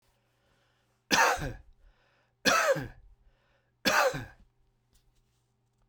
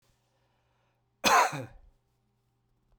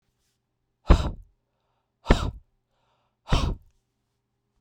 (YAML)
three_cough_length: 5.9 s
three_cough_amplitude: 13495
three_cough_signal_mean_std_ratio: 0.36
cough_length: 3.0 s
cough_amplitude: 12813
cough_signal_mean_std_ratio: 0.27
exhalation_length: 4.6 s
exhalation_amplitude: 27970
exhalation_signal_mean_std_ratio: 0.25
survey_phase: beta (2021-08-13 to 2022-03-07)
age: 45-64
gender: Male
wearing_mask: 'No'
symptom_none: true
smoker_status: Never smoked
respiratory_condition_asthma: false
respiratory_condition_other: false
recruitment_source: REACT
submission_delay: 1 day
covid_test_result: Negative
covid_test_method: RT-qPCR